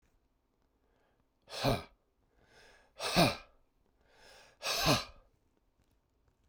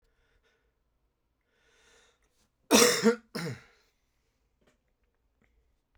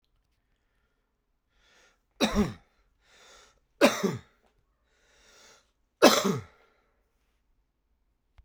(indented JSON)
{
  "exhalation_length": "6.5 s",
  "exhalation_amplitude": 7774,
  "exhalation_signal_mean_std_ratio": 0.31,
  "cough_length": "6.0 s",
  "cough_amplitude": 18685,
  "cough_signal_mean_std_ratio": 0.23,
  "three_cough_length": "8.4 s",
  "three_cough_amplitude": 26670,
  "three_cough_signal_mean_std_ratio": 0.24,
  "survey_phase": "beta (2021-08-13 to 2022-03-07)",
  "age": "45-64",
  "gender": "Male",
  "wearing_mask": "No",
  "symptom_cough_any": true,
  "symptom_runny_or_blocked_nose": true,
  "symptom_fatigue": true,
  "symptom_fever_high_temperature": true,
  "symptom_headache": true,
  "symptom_onset": "3 days",
  "smoker_status": "Never smoked",
  "respiratory_condition_asthma": false,
  "respiratory_condition_other": false,
  "recruitment_source": "Test and Trace",
  "submission_delay": "1 day",
  "covid_test_result": "Positive",
  "covid_test_method": "RT-qPCR"
}